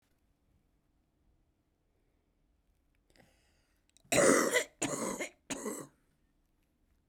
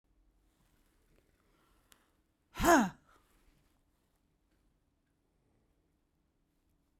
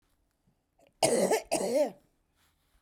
{"three_cough_length": "7.1 s", "three_cough_amplitude": 8152, "three_cough_signal_mean_std_ratio": 0.29, "exhalation_length": "7.0 s", "exhalation_amplitude": 6799, "exhalation_signal_mean_std_ratio": 0.17, "cough_length": "2.8 s", "cough_amplitude": 10577, "cough_signal_mean_std_ratio": 0.44, "survey_phase": "beta (2021-08-13 to 2022-03-07)", "age": "45-64", "gender": "Female", "wearing_mask": "No", "symptom_none": true, "smoker_status": "Ex-smoker", "respiratory_condition_asthma": true, "respiratory_condition_other": false, "recruitment_source": "REACT", "submission_delay": "1 day", "covid_test_result": "Negative", "covid_test_method": "RT-qPCR"}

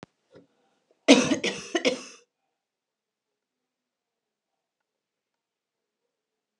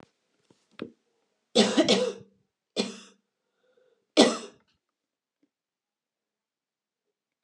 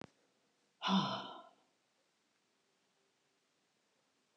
{"cough_length": "6.6 s", "cough_amplitude": 28642, "cough_signal_mean_std_ratio": 0.2, "three_cough_length": "7.4 s", "three_cough_amplitude": 19918, "three_cough_signal_mean_std_ratio": 0.25, "exhalation_length": "4.4 s", "exhalation_amplitude": 2677, "exhalation_signal_mean_std_ratio": 0.26, "survey_phase": "alpha (2021-03-01 to 2021-08-12)", "age": "45-64", "gender": "Female", "wearing_mask": "No", "symptom_none": true, "smoker_status": "Never smoked", "respiratory_condition_asthma": false, "respiratory_condition_other": false, "recruitment_source": "REACT", "submission_delay": "1 day", "covid_test_result": "Negative", "covid_test_method": "RT-qPCR"}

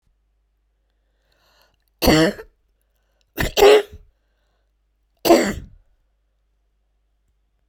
{"three_cough_length": "7.7 s", "three_cough_amplitude": 30661, "three_cough_signal_mean_std_ratio": 0.28, "survey_phase": "beta (2021-08-13 to 2022-03-07)", "age": "65+", "gender": "Female", "wearing_mask": "No", "symptom_cough_any": true, "symptom_runny_or_blocked_nose": true, "symptom_fatigue": true, "symptom_change_to_sense_of_smell_or_taste": true, "smoker_status": "Never smoked", "respiratory_condition_asthma": true, "respiratory_condition_other": false, "recruitment_source": "Test and Trace", "submission_delay": "2 days", "covid_test_result": "Positive", "covid_test_method": "LFT"}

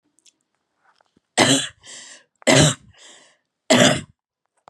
{"three_cough_length": "4.7 s", "three_cough_amplitude": 31994, "three_cough_signal_mean_std_ratio": 0.34, "survey_phase": "beta (2021-08-13 to 2022-03-07)", "age": "18-44", "gender": "Female", "wearing_mask": "No", "symptom_runny_or_blocked_nose": true, "symptom_sore_throat": true, "smoker_status": "Never smoked", "respiratory_condition_asthma": false, "respiratory_condition_other": false, "recruitment_source": "REACT", "submission_delay": "1 day", "covid_test_result": "Negative", "covid_test_method": "RT-qPCR", "influenza_a_test_result": "Negative", "influenza_b_test_result": "Negative"}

